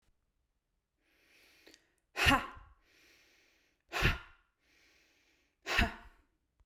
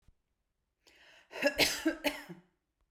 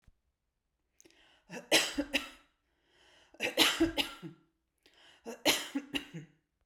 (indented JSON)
{
  "exhalation_length": "6.7 s",
  "exhalation_amplitude": 8060,
  "exhalation_signal_mean_std_ratio": 0.27,
  "cough_length": "2.9 s",
  "cough_amplitude": 8012,
  "cough_signal_mean_std_ratio": 0.36,
  "three_cough_length": "6.7 s",
  "three_cough_amplitude": 9528,
  "three_cough_signal_mean_std_ratio": 0.35,
  "survey_phase": "beta (2021-08-13 to 2022-03-07)",
  "age": "18-44",
  "gender": "Female",
  "wearing_mask": "No",
  "symptom_none": true,
  "smoker_status": "Ex-smoker",
  "respiratory_condition_asthma": false,
  "respiratory_condition_other": false,
  "recruitment_source": "REACT",
  "submission_delay": "9 days",
  "covid_test_result": "Negative",
  "covid_test_method": "RT-qPCR"
}